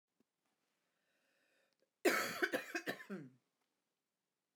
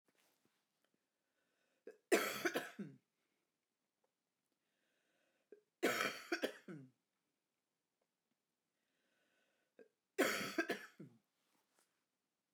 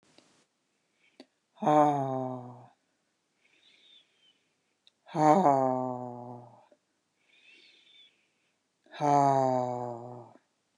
{"cough_length": "4.6 s", "cough_amplitude": 3124, "cough_signal_mean_std_ratio": 0.31, "three_cough_length": "12.5 s", "three_cough_amplitude": 3322, "three_cough_signal_mean_std_ratio": 0.28, "exhalation_length": "10.8 s", "exhalation_amplitude": 12588, "exhalation_signal_mean_std_ratio": 0.36, "survey_phase": "beta (2021-08-13 to 2022-03-07)", "age": "45-64", "gender": "Female", "wearing_mask": "No", "symptom_cough_any": true, "symptom_runny_or_blocked_nose": true, "symptom_onset": "2 days", "smoker_status": "Never smoked", "respiratory_condition_asthma": false, "respiratory_condition_other": false, "recruitment_source": "Test and Trace", "submission_delay": "2 days", "covid_test_result": "Positive", "covid_test_method": "ePCR"}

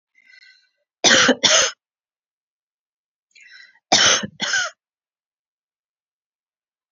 {"cough_length": "6.9 s", "cough_amplitude": 30180, "cough_signal_mean_std_ratio": 0.32, "survey_phase": "beta (2021-08-13 to 2022-03-07)", "age": "45-64", "gender": "Female", "wearing_mask": "No", "symptom_none": true, "smoker_status": "Never smoked", "respiratory_condition_asthma": false, "respiratory_condition_other": false, "recruitment_source": "REACT", "submission_delay": "2 days", "covid_test_result": "Negative", "covid_test_method": "RT-qPCR"}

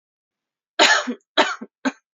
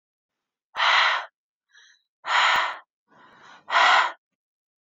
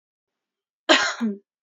{"three_cough_length": "2.1 s", "three_cough_amplitude": 27677, "three_cough_signal_mean_std_ratio": 0.37, "exhalation_length": "4.9 s", "exhalation_amplitude": 19499, "exhalation_signal_mean_std_ratio": 0.43, "cough_length": "1.6 s", "cough_amplitude": 26873, "cough_signal_mean_std_ratio": 0.36, "survey_phase": "beta (2021-08-13 to 2022-03-07)", "age": "18-44", "gender": "Female", "wearing_mask": "No", "symptom_none": true, "symptom_onset": "6 days", "smoker_status": "Never smoked", "respiratory_condition_asthma": false, "respiratory_condition_other": false, "recruitment_source": "REACT", "submission_delay": "3 days", "covid_test_result": "Negative", "covid_test_method": "RT-qPCR"}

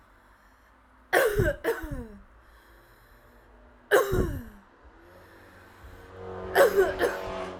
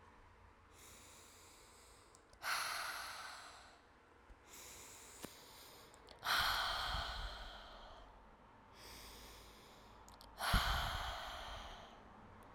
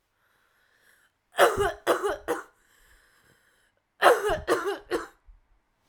{"three_cough_length": "7.6 s", "three_cough_amplitude": 15421, "three_cough_signal_mean_std_ratio": 0.44, "exhalation_length": "12.5 s", "exhalation_amplitude": 3039, "exhalation_signal_mean_std_ratio": 0.54, "cough_length": "5.9 s", "cough_amplitude": 25097, "cough_signal_mean_std_ratio": 0.37, "survey_phase": "alpha (2021-03-01 to 2021-08-12)", "age": "18-44", "gender": "Female", "wearing_mask": "No", "symptom_cough_any": true, "symptom_shortness_of_breath": true, "symptom_diarrhoea": true, "symptom_fatigue": true, "symptom_headache": true, "symptom_onset": "4 days", "smoker_status": "Never smoked", "respiratory_condition_asthma": true, "respiratory_condition_other": false, "recruitment_source": "Test and Trace", "submission_delay": "2 days", "covid_test_result": "Positive", "covid_test_method": "RT-qPCR", "covid_ct_value": 30.7, "covid_ct_gene": "N gene"}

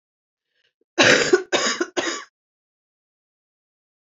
{"cough_length": "4.0 s", "cough_amplitude": 28057, "cough_signal_mean_std_ratio": 0.34, "survey_phase": "beta (2021-08-13 to 2022-03-07)", "age": "45-64", "gender": "Female", "wearing_mask": "No", "symptom_cough_any": true, "symptom_new_continuous_cough": true, "symptom_runny_or_blocked_nose": true, "symptom_shortness_of_breath": true, "symptom_sore_throat": true, "symptom_abdominal_pain": true, "symptom_fatigue": true, "symptom_headache": true, "symptom_change_to_sense_of_smell_or_taste": true, "symptom_loss_of_taste": true, "symptom_onset": "5 days", "smoker_status": "Never smoked", "respiratory_condition_asthma": false, "respiratory_condition_other": false, "recruitment_source": "Test and Trace", "submission_delay": "2 days", "covid_test_result": "Positive", "covid_test_method": "RT-qPCR", "covid_ct_value": 14.7, "covid_ct_gene": "ORF1ab gene", "covid_ct_mean": 15.0, "covid_viral_load": "12000000 copies/ml", "covid_viral_load_category": "High viral load (>1M copies/ml)"}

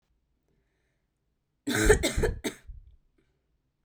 {"cough_length": "3.8 s", "cough_amplitude": 14218, "cough_signal_mean_std_ratio": 0.33, "survey_phase": "beta (2021-08-13 to 2022-03-07)", "age": "18-44", "gender": "Female", "wearing_mask": "No", "symptom_cough_any": true, "symptom_runny_or_blocked_nose": true, "symptom_sore_throat": true, "symptom_fatigue": true, "symptom_headache": true, "smoker_status": "Never smoked", "respiratory_condition_asthma": false, "respiratory_condition_other": false, "recruitment_source": "Test and Trace", "submission_delay": "1 day", "covid_test_result": "Positive", "covid_test_method": "RT-qPCR", "covid_ct_value": 29.6, "covid_ct_gene": "N gene", "covid_ct_mean": 30.1, "covid_viral_load": "130 copies/ml", "covid_viral_load_category": "Minimal viral load (< 10K copies/ml)"}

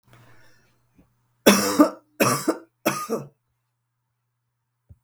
{"three_cough_length": "5.0 s", "three_cough_amplitude": 32766, "three_cough_signal_mean_std_ratio": 0.31, "survey_phase": "beta (2021-08-13 to 2022-03-07)", "age": "65+", "gender": "Female", "wearing_mask": "No", "symptom_none": true, "smoker_status": "Never smoked", "respiratory_condition_asthma": false, "respiratory_condition_other": false, "recruitment_source": "REACT", "submission_delay": "3 days", "covid_test_result": "Negative", "covid_test_method": "RT-qPCR", "influenza_a_test_result": "Negative", "influenza_b_test_result": "Negative"}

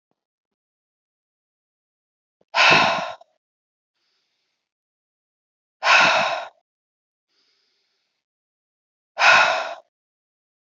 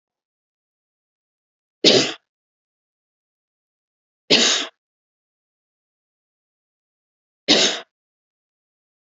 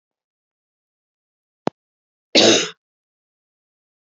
{"exhalation_length": "10.8 s", "exhalation_amplitude": 26784, "exhalation_signal_mean_std_ratio": 0.3, "three_cough_length": "9.0 s", "three_cough_amplitude": 32768, "three_cough_signal_mean_std_ratio": 0.24, "cough_length": "4.0 s", "cough_amplitude": 32768, "cough_signal_mean_std_ratio": 0.22, "survey_phase": "beta (2021-08-13 to 2022-03-07)", "age": "18-44", "gender": "Female", "wearing_mask": "No", "symptom_none": true, "smoker_status": "Ex-smoker", "respiratory_condition_asthma": false, "respiratory_condition_other": false, "recruitment_source": "REACT", "submission_delay": "1 day", "covid_test_result": "Negative", "covid_test_method": "RT-qPCR"}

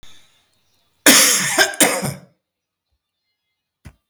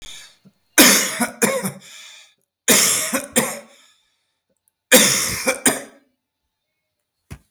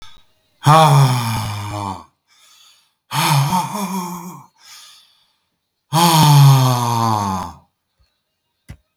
{"cough_length": "4.1 s", "cough_amplitude": 32768, "cough_signal_mean_std_ratio": 0.37, "three_cough_length": "7.5 s", "three_cough_amplitude": 32768, "three_cough_signal_mean_std_ratio": 0.41, "exhalation_length": "9.0 s", "exhalation_amplitude": 32768, "exhalation_signal_mean_std_ratio": 0.52, "survey_phase": "beta (2021-08-13 to 2022-03-07)", "age": "65+", "gender": "Male", "wearing_mask": "No", "symptom_none": true, "smoker_status": "Never smoked", "respiratory_condition_asthma": false, "respiratory_condition_other": false, "recruitment_source": "REACT", "submission_delay": "2 days", "covid_test_result": "Negative", "covid_test_method": "RT-qPCR", "influenza_a_test_result": "Negative", "influenza_b_test_result": "Negative"}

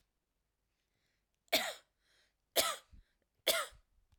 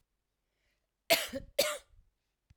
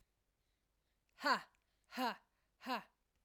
{"three_cough_length": "4.2 s", "three_cough_amplitude": 5321, "three_cough_signal_mean_std_ratio": 0.28, "cough_length": "2.6 s", "cough_amplitude": 8405, "cough_signal_mean_std_ratio": 0.28, "exhalation_length": "3.2 s", "exhalation_amplitude": 2344, "exhalation_signal_mean_std_ratio": 0.31, "survey_phase": "alpha (2021-03-01 to 2021-08-12)", "age": "18-44", "gender": "Female", "wearing_mask": "No", "symptom_none": true, "smoker_status": "Never smoked", "respiratory_condition_asthma": false, "respiratory_condition_other": false, "recruitment_source": "REACT", "submission_delay": "1 day", "covid_test_result": "Negative", "covid_test_method": "RT-qPCR"}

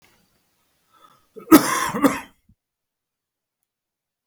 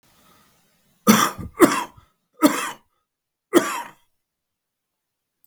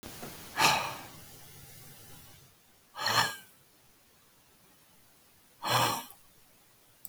{"cough_length": "4.3 s", "cough_amplitude": 32768, "cough_signal_mean_std_ratio": 0.23, "three_cough_length": "5.5 s", "three_cough_amplitude": 32768, "three_cough_signal_mean_std_ratio": 0.29, "exhalation_length": "7.1 s", "exhalation_amplitude": 10401, "exhalation_signal_mean_std_ratio": 0.38, "survey_phase": "beta (2021-08-13 to 2022-03-07)", "age": "45-64", "gender": "Male", "wearing_mask": "No", "symptom_none": true, "smoker_status": "Current smoker (11 or more cigarettes per day)", "respiratory_condition_asthma": false, "respiratory_condition_other": false, "recruitment_source": "REACT", "submission_delay": "1 day", "covid_test_result": "Negative", "covid_test_method": "RT-qPCR", "influenza_a_test_result": "Negative", "influenza_b_test_result": "Negative"}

